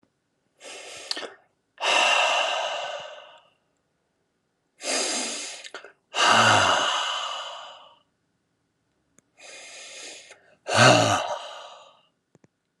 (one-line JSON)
{"exhalation_length": "12.8 s", "exhalation_amplitude": 22329, "exhalation_signal_mean_std_ratio": 0.44, "survey_phase": "alpha (2021-03-01 to 2021-08-12)", "age": "45-64", "gender": "Male", "wearing_mask": "No", "symptom_none": true, "smoker_status": "Never smoked", "respiratory_condition_asthma": false, "respiratory_condition_other": false, "recruitment_source": "REACT", "submission_delay": "3 days", "covid_test_result": "Negative", "covid_test_method": "RT-qPCR"}